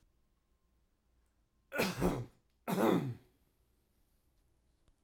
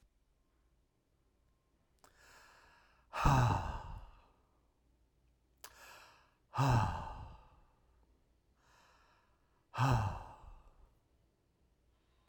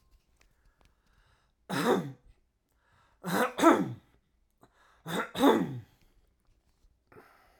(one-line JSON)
{"cough_length": "5.0 s", "cough_amplitude": 4352, "cough_signal_mean_std_ratio": 0.35, "exhalation_length": "12.3 s", "exhalation_amplitude": 5252, "exhalation_signal_mean_std_ratio": 0.32, "three_cough_length": "7.6 s", "three_cough_amplitude": 13185, "three_cough_signal_mean_std_ratio": 0.33, "survey_phase": "alpha (2021-03-01 to 2021-08-12)", "age": "45-64", "gender": "Male", "wearing_mask": "No", "symptom_fatigue": true, "symptom_fever_high_temperature": true, "symptom_headache": true, "symptom_onset": "3 days", "smoker_status": "Ex-smoker", "respiratory_condition_asthma": false, "respiratory_condition_other": false, "recruitment_source": "REACT", "submission_delay": "3 days", "covid_test_result": "Negative", "covid_test_method": "RT-qPCR"}